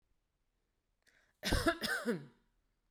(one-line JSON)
{"cough_length": "2.9 s", "cough_amplitude": 4584, "cough_signal_mean_std_ratio": 0.37, "survey_phase": "beta (2021-08-13 to 2022-03-07)", "age": "18-44", "gender": "Female", "wearing_mask": "No", "symptom_none": true, "smoker_status": "Never smoked", "respiratory_condition_asthma": false, "respiratory_condition_other": false, "recruitment_source": "REACT", "submission_delay": "0 days", "covid_test_result": "Negative", "covid_test_method": "RT-qPCR"}